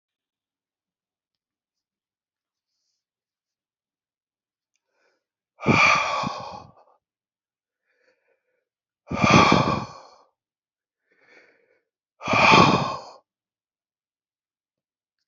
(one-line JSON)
{"exhalation_length": "15.3 s", "exhalation_amplitude": 27945, "exhalation_signal_mean_std_ratio": 0.28, "survey_phase": "alpha (2021-03-01 to 2021-08-12)", "age": "65+", "gender": "Male", "wearing_mask": "No", "symptom_none": true, "smoker_status": "Never smoked", "respiratory_condition_asthma": false, "respiratory_condition_other": false, "recruitment_source": "REACT", "submission_delay": "3 days", "covid_test_result": "Negative", "covid_test_method": "RT-qPCR"}